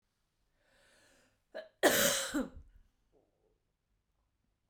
{"cough_length": "4.7 s", "cough_amplitude": 7931, "cough_signal_mean_std_ratio": 0.29, "survey_phase": "beta (2021-08-13 to 2022-03-07)", "age": "45-64", "gender": "Female", "wearing_mask": "No", "symptom_runny_or_blocked_nose": true, "smoker_status": "Never smoked", "respiratory_condition_asthma": false, "respiratory_condition_other": false, "recruitment_source": "REACT", "submission_delay": "2 days", "covid_test_result": "Negative", "covid_test_method": "RT-qPCR", "influenza_a_test_result": "Negative", "influenza_b_test_result": "Negative"}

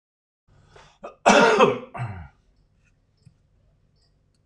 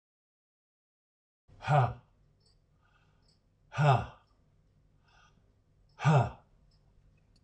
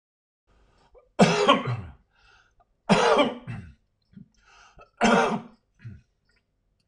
{"cough_length": "4.5 s", "cough_amplitude": 25940, "cough_signal_mean_std_ratio": 0.3, "exhalation_length": "7.4 s", "exhalation_amplitude": 7846, "exhalation_signal_mean_std_ratio": 0.28, "three_cough_length": "6.9 s", "three_cough_amplitude": 21198, "three_cough_signal_mean_std_ratio": 0.37, "survey_phase": "alpha (2021-03-01 to 2021-08-12)", "age": "65+", "gender": "Male", "wearing_mask": "No", "symptom_none": true, "smoker_status": "Ex-smoker", "respiratory_condition_asthma": false, "respiratory_condition_other": false, "recruitment_source": "REACT", "submission_delay": "1 day", "covid_test_result": "Negative", "covid_test_method": "RT-qPCR"}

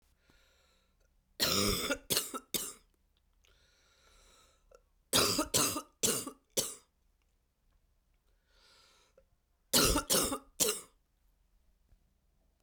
{"three_cough_length": "12.6 s", "three_cough_amplitude": 11724, "three_cough_signal_mean_std_ratio": 0.36, "survey_phase": "beta (2021-08-13 to 2022-03-07)", "age": "65+", "gender": "Female", "wearing_mask": "No", "symptom_cough_any": true, "symptom_new_continuous_cough": true, "symptom_runny_or_blocked_nose": true, "symptom_abdominal_pain": true, "symptom_fatigue": true, "symptom_fever_high_temperature": true, "symptom_headache": true, "symptom_change_to_sense_of_smell_or_taste": true, "symptom_loss_of_taste": true, "symptom_other": true, "smoker_status": "Never smoked", "respiratory_condition_asthma": false, "respiratory_condition_other": false, "recruitment_source": "Test and Trace", "submission_delay": "2 days", "covid_test_result": "Positive", "covid_test_method": "RT-qPCR", "covid_ct_value": 17.7, "covid_ct_gene": "ORF1ab gene", "covid_ct_mean": 18.1, "covid_viral_load": "1200000 copies/ml", "covid_viral_load_category": "High viral load (>1M copies/ml)"}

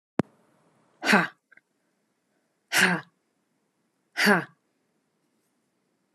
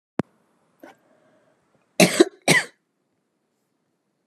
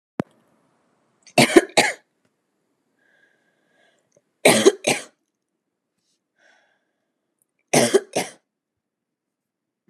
{"exhalation_length": "6.1 s", "exhalation_amplitude": 16563, "exhalation_signal_mean_std_ratio": 0.27, "cough_length": "4.3 s", "cough_amplitude": 30121, "cough_signal_mean_std_ratio": 0.22, "three_cough_length": "9.9 s", "three_cough_amplitude": 32768, "three_cough_signal_mean_std_ratio": 0.24, "survey_phase": "alpha (2021-03-01 to 2021-08-12)", "age": "18-44", "gender": "Female", "wearing_mask": "No", "symptom_none": true, "smoker_status": "Never smoked", "respiratory_condition_asthma": false, "respiratory_condition_other": false, "recruitment_source": "REACT", "submission_delay": "12 days", "covid_test_result": "Negative", "covid_test_method": "RT-qPCR"}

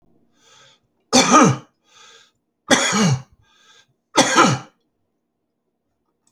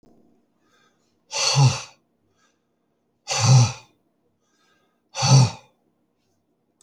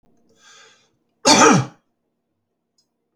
{"three_cough_length": "6.3 s", "three_cough_amplitude": 32767, "three_cough_signal_mean_std_ratio": 0.37, "exhalation_length": "6.8 s", "exhalation_amplitude": 22089, "exhalation_signal_mean_std_ratio": 0.33, "cough_length": "3.2 s", "cough_amplitude": 30729, "cough_signal_mean_std_ratio": 0.29, "survey_phase": "beta (2021-08-13 to 2022-03-07)", "age": "65+", "gender": "Male", "wearing_mask": "No", "symptom_none": true, "smoker_status": "Ex-smoker", "respiratory_condition_asthma": false, "respiratory_condition_other": false, "recruitment_source": "REACT", "submission_delay": "2 days", "covid_test_result": "Negative", "covid_test_method": "RT-qPCR"}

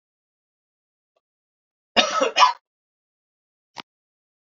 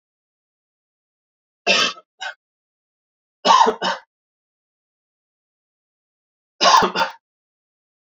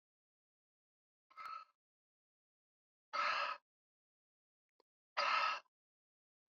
{"cough_length": "4.4 s", "cough_amplitude": 28028, "cough_signal_mean_std_ratio": 0.24, "three_cough_length": "8.0 s", "three_cough_amplitude": 28293, "three_cough_signal_mean_std_ratio": 0.28, "exhalation_length": "6.5 s", "exhalation_amplitude": 2255, "exhalation_signal_mean_std_ratio": 0.31, "survey_phase": "beta (2021-08-13 to 2022-03-07)", "age": "18-44", "gender": "Male", "wearing_mask": "No", "symptom_none": true, "smoker_status": "Never smoked", "respiratory_condition_asthma": false, "respiratory_condition_other": false, "recruitment_source": "REACT", "submission_delay": "4 days", "covid_test_result": "Negative", "covid_test_method": "RT-qPCR"}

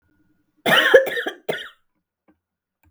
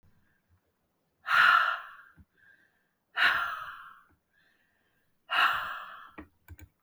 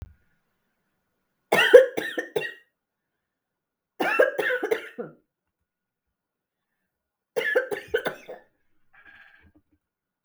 {"cough_length": "2.9 s", "cough_amplitude": 32768, "cough_signal_mean_std_ratio": 0.35, "exhalation_length": "6.8 s", "exhalation_amplitude": 11570, "exhalation_signal_mean_std_ratio": 0.37, "three_cough_length": "10.2 s", "three_cough_amplitude": 32768, "three_cough_signal_mean_std_ratio": 0.27, "survey_phase": "beta (2021-08-13 to 2022-03-07)", "age": "45-64", "gender": "Female", "wearing_mask": "No", "symptom_new_continuous_cough": true, "symptom_sore_throat": true, "symptom_fatigue": true, "symptom_change_to_sense_of_smell_or_taste": true, "smoker_status": "Ex-smoker", "respiratory_condition_asthma": false, "respiratory_condition_other": false, "recruitment_source": "Test and Trace", "submission_delay": "2 days", "covid_test_method": "RT-qPCR", "covid_ct_value": 36.3, "covid_ct_gene": "ORF1ab gene"}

